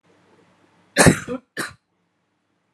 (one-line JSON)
{"cough_length": "2.7 s", "cough_amplitude": 32767, "cough_signal_mean_std_ratio": 0.25, "survey_phase": "alpha (2021-03-01 to 2021-08-12)", "age": "18-44", "gender": "Female", "wearing_mask": "No", "symptom_cough_any": true, "symptom_new_continuous_cough": true, "symptom_shortness_of_breath": true, "symptom_fatigue": true, "symptom_headache": true, "smoker_status": "Ex-smoker", "respiratory_condition_asthma": true, "respiratory_condition_other": false, "recruitment_source": "Test and Trace", "submission_delay": "2 days", "covid_test_result": "Positive", "covid_test_method": "RT-qPCR", "covid_ct_value": 14.4, "covid_ct_gene": "ORF1ab gene", "covid_ct_mean": 14.8, "covid_viral_load": "14000000 copies/ml", "covid_viral_load_category": "High viral load (>1M copies/ml)"}